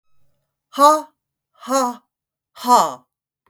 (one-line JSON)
{"exhalation_length": "3.5 s", "exhalation_amplitude": 32768, "exhalation_signal_mean_std_ratio": 0.35, "survey_phase": "beta (2021-08-13 to 2022-03-07)", "age": "45-64", "gender": "Female", "wearing_mask": "No", "symptom_cough_any": true, "symptom_onset": "8 days", "smoker_status": "Never smoked", "respiratory_condition_asthma": false, "respiratory_condition_other": false, "recruitment_source": "REACT", "submission_delay": "1 day", "covid_test_result": "Negative", "covid_test_method": "RT-qPCR", "influenza_a_test_result": "Negative", "influenza_b_test_result": "Negative"}